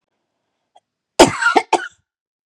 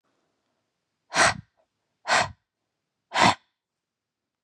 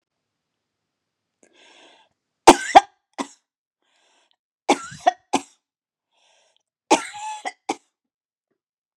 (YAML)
cough_length: 2.5 s
cough_amplitude: 32768
cough_signal_mean_std_ratio: 0.29
exhalation_length: 4.4 s
exhalation_amplitude: 22069
exhalation_signal_mean_std_ratio: 0.28
three_cough_length: 9.0 s
three_cough_amplitude: 32768
three_cough_signal_mean_std_ratio: 0.17
survey_phase: beta (2021-08-13 to 2022-03-07)
age: 18-44
gender: Female
wearing_mask: 'No'
symptom_none: true
smoker_status: Never smoked
respiratory_condition_asthma: true
respiratory_condition_other: false
recruitment_source: REACT
submission_delay: 3 days
covid_test_result: Negative
covid_test_method: RT-qPCR
influenza_a_test_result: Negative
influenza_b_test_result: Negative